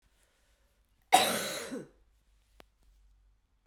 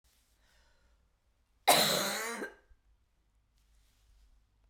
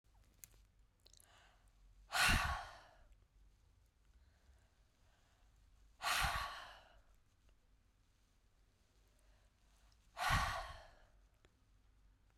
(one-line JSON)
{"three_cough_length": "3.7 s", "three_cough_amplitude": 14005, "three_cough_signal_mean_std_ratio": 0.27, "cough_length": "4.7 s", "cough_amplitude": 11121, "cough_signal_mean_std_ratio": 0.29, "exhalation_length": "12.4 s", "exhalation_amplitude": 3257, "exhalation_signal_mean_std_ratio": 0.32, "survey_phase": "beta (2021-08-13 to 2022-03-07)", "age": "65+", "gender": "Female", "wearing_mask": "No", "symptom_none": true, "smoker_status": "Ex-smoker", "respiratory_condition_asthma": false, "respiratory_condition_other": false, "recruitment_source": "REACT", "submission_delay": "1 day", "covid_test_result": "Negative", "covid_test_method": "RT-qPCR", "influenza_a_test_result": "Unknown/Void", "influenza_b_test_result": "Unknown/Void"}